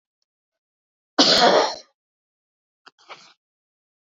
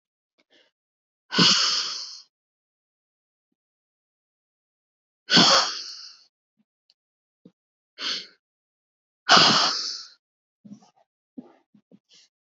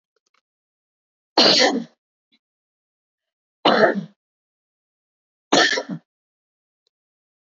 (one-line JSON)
{"cough_length": "4.1 s", "cough_amplitude": 26302, "cough_signal_mean_std_ratio": 0.3, "exhalation_length": "12.5 s", "exhalation_amplitude": 28347, "exhalation_signal_mean_std_ratio": 0.29, "three_cough_length": "7.5 s", "three_cough_amplitude": 26628, "three_cough_signal_mean_std_ratio": 0.3, "survey_phase": "beta (2021-08-13 to 2022-03-07)", "age": "45-64", "gender": "Female", "wearing_mask": "No", "symptom_none": true, "smoker_status": "Never smoked", "respiratory_condition_asthma": false, "respiratory_condition_other": false, "recruitment_source": "REACT", "submission_delay": "2 days", "covid_test_result": "Negative", "covid_test_method": "RT-qPCR", "influenza_a_test_result": "Unknown/Void", "influenza_b_test_result": "Unknown/Void"}